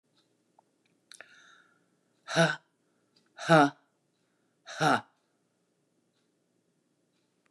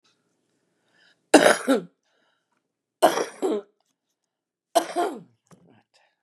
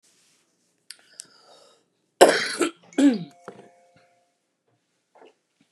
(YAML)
exhalation_length: 7.5 s
exhalation_amplitude: 12654
exhalation_signal_mean_std_ratio: 0.23
three_cough_length: 6.2 s
three_cough_amplitude: 31753
three_cough_signal_mean_std_ratio: 0.28
cough_length: 5.7 s
cough_amplitude: 32768
cough_signal_mean_std_ratio: 0.24
survey_phase: beta (2021-08-13 to 2022-03-07)
age: 65+
gender: Female
wearing_mask: 'No'
symptom_cough_any: true
symptom_onset: 8 days
smoker_status: Ex-smoker
respiratory_condition_asthma: false
respiratory_condition_other: false
recruitment_source: REACT
submission_delay: 1 day
covid_test_result: Negative
covid_test_method: RT-qPCR